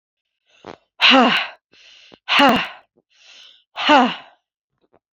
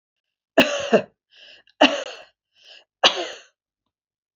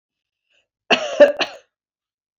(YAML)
exhalation_length: 5.1 s
exhalation_amplitude: 29149
exhalation_signal_mean_std_ratio: 0.38
three_cough_length: 4.4 s
three_cough_amplitude: 31313
three_cough_signal_mean_std_ratio: 0.3
cough_length: 2.4 s
cough_amplitude: 32079
cough_signal_mean_std_ratio: 0.28
survey_phase: beta (2021-08-13 to 2022-03-07)
age: 45-64
gender: Female
wearing_mask: 'No'
symptom_none: true
smoker_status: Ex-smoker
respiratory_condition_asthma: false
respiratory_condition_other: false
recruitment_source: REACT
submission_delay: 1 day
covid_test_result: Negative
covid_test_method: RT-qPCR
influenza_a_test_result: Unknown/Void
influenza_b_test_result: Unknown/Void